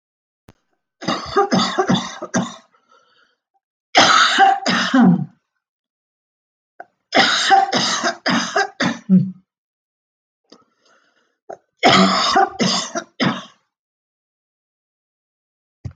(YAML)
three_cough_length: 16.0 s
three_cough_amplitude: 30058
three_cough_signal_mean_std_ratio: 0.46
survey_phase: alpha (2021-03-01 to 2021-08-12)
age: 45-64
gender: Female
wearing_mask: 'No'
symptom_cough_any: true
symptom_shortness_of_breath: true
symptom_onset: 12 days
smoker_status: Never smoked
respiratory_condition_asthma: false
respiratory_condition_other: false
recruitment_source: REACT
submission_delay: 1 day
covid_test_result: Negative
covid_test_method: RT-qPCR